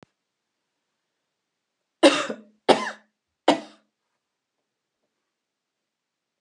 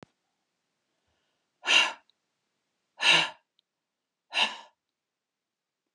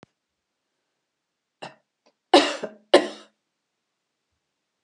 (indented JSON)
{
  "three_cough_length": "6.4 s",
  "three_cough_amplitude": 30096,
  "three_cough_signal_mean_std_ratio": 0.19,
  "exhalation_length": "5.9 s",
  "exhalation_amplitude": 12668,
  "exhalation_signal_mean_std_ratio": 0.26,
  "cough_length": "4.8 s",
  "cough_amplitude": 31458,
  "cough_signal_mean_std_ratio": 0.19,
  "survey_phase": "beta (2021-08-13 to 2022-03-07)",
  "age": "65+",
  "gender": "Female",
  "wearing_mask": "No",
  "symptom_none": true,
  "smoker_status": "Never smoked",
  "respiratory_condition_asthma": false,
  "respiratory_condition_other": false,
  "recruitment_source": "REACT",
  "submission_delay": "3 days",
  "covid_test_result": "Negative",
  "covid_test_method": "RT-qPCR"
}